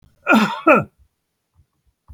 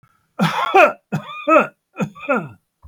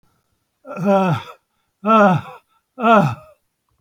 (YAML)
cough_length: 2.1 s
cough_amplitude: 30555
cough_signal_mean_std_ratio: 0.37
three_cough_length: 2.9 s
three_cough_amplitude: 31370
three_cough_signal_mean_std_ratio: 0.47
exhalation_length: 3.8 s
exhalation_amplitude: 27642
exhalation_signal_mean_std_ratio: 0.46
survey_phase: beta (2021-08-13 to 2022-03-07)
age: 65+
gender: Male
wearing_mask: 'No'
symptom_cough_any: true
symptom_runny_or_blocked_nose: true
symptom_shortness_of_breath: true
symptom_abdominal_pain: true
symptom_fatigue: true
smoker_status: Never smoked
respiratory_condition_asthma: false
respiratory_condition_other: false
recruitment_source: REACT
submission_delay: 4 days
covid_test_result: Negative
covid_test_method: RT-qPCR